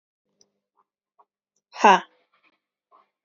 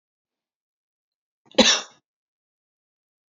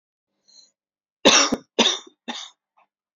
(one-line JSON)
{"exhalation_length": "3.2 s", "exhalation_amplitude": 27868, "exhalation_signal_mean_std_ratio": 0.17, "cough_length": "3.3 s", "cough_amplitude": 30179, "cough_signal_mean_std_ratio": 0.19, "three_cough_length": "3.2 s", "three_cough_amplitude": 26771, "three_cough_signal_mean_std_ratio": 0.31, "survey_phase": "alpha (2021-03-01 to 2021-08-12)", "age": "18-44", "gender": "Female", "wearing_mask": "No", "symptom_none": true, "smoker_status": "Never smoked", "respiratory_condition_asthma": true, "respiratory_condition_other": false, "recruitment_source": "REACT", "submission_delay": "2 days", "covid_test_result": "Negative", "covid_test_method": "RT-qPCR"}